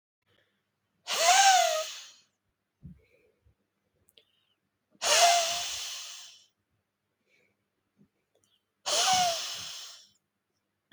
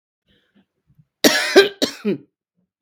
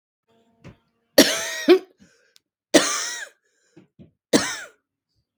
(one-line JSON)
{"exhalation_length": "10.9 s", "exhalation_amplitude": 12164, "exhalation_signal_mean_std_ratio": 0.37, "cough_length": "2.8 s", "cough_amplitude": 32768, "cough_signal_mean_std_ratio": 0.32, "three_cough_length": "5.4 s", "three_cough_amplitude": 32768, "three_cough_signal_mean_std_ratio": 0.3, "survey_phase": "beta (2021-08-13 to 2022-03-07)", "age": "45-64", "gender": "Female", "wearing_mask": "No", "symptom_cough_any": true, "symptom_other": true, "smoker_status": "Never smoked", "respiratory_condition_asthma": true, "respiratory_condition_other": false, "recruitment_source": "Test and Trace", "submission_delay": "-1 day", "covid_test_result": "Positive", "covid_test_method": "LFT"}